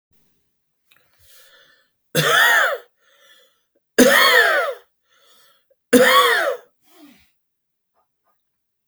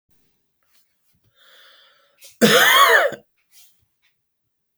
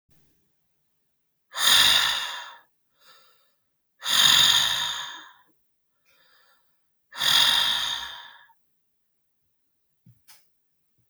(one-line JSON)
{"three_cough_length": "8.9 s", "three_cough_amplitude": 32767, "three_cough_signal_mean_std_ratio": 0.39, "cough_length": "4.8 s", "cough_amplitude": 30874, "cough_signal_mean_std_ratio": 0.32, "exhalation_length": "11.1 s", "exhalation_amplitude": 19752, "exhalation_signal_mean_std_ratio": 0.39, "survey_phase": "beta (2021-08-13 to 2022-03-07)", "age": "45-64", "gender": "Male", "wearing_mask": "No", "symptom_none": true, "smoker_status": "Never smoked", "respiratory_condition_asthma": false, "respiratory_condition_other": false, "recruitment_source": "REACT", "submission_delay": "2 days", "covid_test_result": "Negative", "covid_test_method": "RT-qPCR", "influenza_a_test_result": "Unknown/Void", "influenza_b_test_result": "Unknown/Void"}